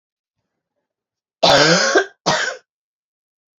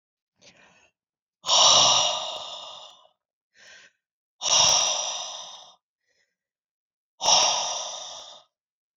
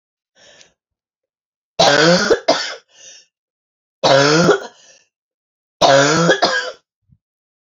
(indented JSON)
{
  "cough_length": "3.6 s",
  "cough_amplitude": 32767,
  "cough_signal_mean_std_ratio": 0.4,
  "exhalation_length": "9.0 s",
  "exhalation_amplitude": 20130,
  "exhalation_signal_mean_std_ratio": 0.42,
  "three_cough_length": "7.8 s",
  "three_cough_amplitude": 31456,
  "three_cough_signal_mean_std_ratio": 0.45,
  "survey_phase": "beta (2021-08-13 to 2022-03-07)",
  "age": "45-64",
  "gender": "Female",
  "wearing_mask": "No",
  "symptom_cough_any": true,
  "symptom_new_continuous_cough": true,
  "symptom_shortness_of_breath": true,
  "symptom_sore_throat": true,
  "symptom_diarrhoea": true,
  "symptom_fever_high_temperature": true,
  "symptom_headache": true,
  "symptom_onset": "4 days",
  "smoker_status": "Never smoked",
  "respiratory_condition_asthma": false,
  "respiratory_condition_other": false,
  "recruitment_source": "Test and Trace",
  "submission_delay": "1 day",
  "covid_test_result": "Positive",
  "covid_test_method": "RT-qPCR"
}